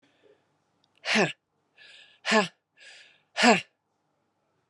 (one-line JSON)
{"exhalation_length": "4.7 s", "exhalation_amplitude": 18258, "exhalation_signal_mean_std_ratio": 0.29, "survey_phase": "beta (2021-08-13 to 2022-03-07)", "age": "45-64", "gender": "Female", "wearing_mask": "No", "symptom_cough_any": true, "symptom_runny_or_blocked_nose": true, "symptom_loss_of_taste": true, "smoker_status": "Ex-smoker", "respiratory_condition_asthma": false, "respiratory_condition_other": false, "recruitment_source": "Test and Trace", "submission_delay": "1 day", "covid_test_result": "Positive", "covid_test_method": "RT-qPCR"}